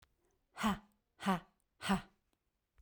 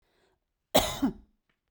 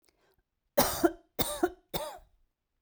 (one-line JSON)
{"exhalation_length": "2.8 s", "exhalation_amplitude": 2944, "exhalation_signal_mean_std_ratio": 0.35, "cough_length": "1.7 s", "cough_amplitude": 13219, "cough_signal_mean_std_ratio": 0.31, "three_cough_length": "2.8 s", "three_cough_amplitude": 10261, "three_cough_signal_mean_std_ratio": 0.35, "survey_phase": "beta (2021-08-13 to 2022-03-07)", "age": "45-64", "gender": "Female", "wearing_mask": "No", "symptom_none": true, "smoker_status": "Never smoked", "respiratory_condition_asthma": false, "respiratory_condition_other": false, "recruitment_source": "REACT", "submission_delay": "0 days", "covid_test_result": "Negative", "covid_test_method": "RT-qPCR"}